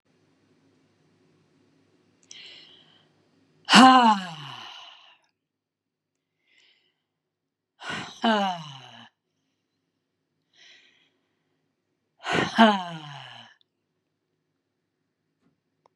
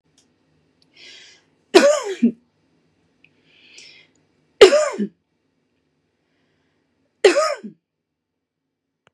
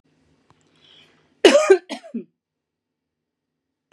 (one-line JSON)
{"exhalation_length": "16.0 s", "exhalation_amplitude": 30972, "exhalation_signal_mean_std_ratio": 0.23, "three_cough_length": "9.1 s", "three_cough_amplitude": 32768, "three_cough_signal_mean_std_ratio": 0.25, "cough_length": "3.9 s", "cough_amplitude": 32760, "cough_signal_mean_std_ratio": 0.24, "survey_phase": "beta (2021-08-13 to 2022-03-07)", "age": "45-64", "gender": "Female", "wearing_mask": "No", "symptom_abdominal_pain": true, "symptom_diarrhoea": true, "symptom_headache": true, "symptom_onset": "6 days", "smoker_status": "Ex-smoker", "respiratory_condition_asthma": true, "respiratory_condition_other": false, "recruitment_source": "REACT", "submission_delay": "1 day", "covid_test_result": "Negative", "covid_test_method": "RT-qPCR", "influenza_a_test_result": "Negative", "influenza_b_test_result": "Negative"}